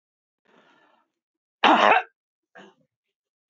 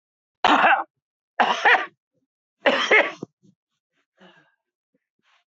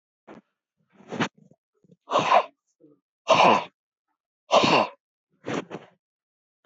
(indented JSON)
{
  "cough_length": "3.5 s",
  "cough_amplitude": 23205,
  "cough_signal_mean_std_ratio": 0.26,
  "three_cough_length": "5.5 s",
  "three_cough_amplitude": 22705,
  "three_cough_signal_mean_std_ratio": 0.36,
  "exhalation_length": "6.7 s",
  "exhalation_amplitude": 20209,
  "exhalation_signal_mean_std_ratio": 0.34,
  "survey_phase": "beta (2021-08-13 to 2022-03-07)",
  "age": "65+",
  "gender": "Male",
  "wearing_mask": "No",
  "symptom_none": true,
  "smoker_status": "Never smoked",
  "respiratory_condition_asthma": false,
  "respiratory_condition_other": false,
  "recruitment_source": "REACT",
  "submission_delay": "1 day",
  "covid_test_result": "Negative",
  "covid_test_method": "RT-qPCR"
}